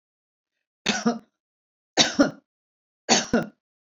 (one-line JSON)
{"three_cough_length": "3.9 s", "three_cough_amplitude": 23531, "three_cough_signal_mean_std_ratio": 0.33, "survey_phase": "beta (2021-08-13 to 2022-03-07)", "age": "65+", "gender": "Female", "wearing_mask": "No", "symptom_none": true, "smoker_status": "Never smoked", "respiratory_condition_asthma": false, "respiratory_condition_other": false, "recruitment_source": "REACT", "submission_delay": "1 day", "covid_test_result": "Negative", "covid_test_method": "RT-qPCR"}